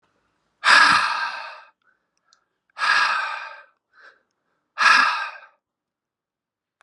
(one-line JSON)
{"exhalation_length": "6.8 s", "exhalation_amplitude": 31169, "exhalation_signal_mean_std_ratio": 0.39, "survey_phase": "beta (2021-08-13 to 2022-03-07)", "age": "45-64", "gender": "Male", "wearing_mask": "No", "symptom_cough_any": true, "symptom_runny_or_blocked_nose": true, "symptom_sore_throat": true, "symptom_onset": "4 days", "smoker_status": "Never smoked", "respiratory_condition_asthma": false, "respiratory_condition_other": false, "recruitment_source": "Test and Trace", "submission_delay": "2 days", "covid_test_result": "Positive", "covid_test_method": "RT-qPCR", "covid_ct_value": 15.1, "covid_ct_gene": "ORF1ab gene", "covid_ct_mean": 15.4, "covid_viral_load": "9100000 copies/ml", "covid_viral_load_category": "High viral load (>1M copies/ml)"}